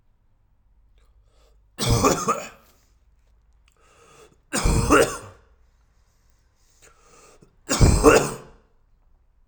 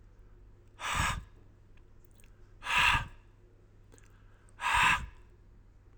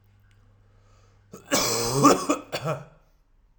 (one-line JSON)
{"three_cough_length": "9.5 s", "three_cough_amplitude": 30298, "three_cough_signal_mean_std_ratio": 0.34, "exhalation_length": "6.0 s", "exhalation_amplitude": 6830, "exhalation_signal_mean_std_ratio": 0.41, "cough_length": "3.6 s", "cough_amplitude": 23582, "cough_signal_mean_std_ratio": 0.41, "survey_phase": "alpha (2021-03-01 to 2021-08-12)", "age": "18-44", "gender": "Male", "wearing_mask": "No", "symptom_shortness_of_breath": true, "symptom_fatigue": true, "symptom_change_to_sense_of_smell_or_taste": true, "symptom_onset": "4 days", "smoker_status": "Never smoked", "respiratory_condition_asthma": false, "respiratory_condition_other": false, "recruitment_source": "Test and Trace", "submission_delay": "2 days", "covid_test_result": "Positive", "covid_test_method": "RT-qPCR", "covid_ct_value": 15.7, "covid_ct_gene": "ORF1ab gene", "covid_ct_mean": 16.0, "covid_viral_load": "5500000 copies/ml", "covid_viral_load_category": "High viral load (>1M copies/ml)"}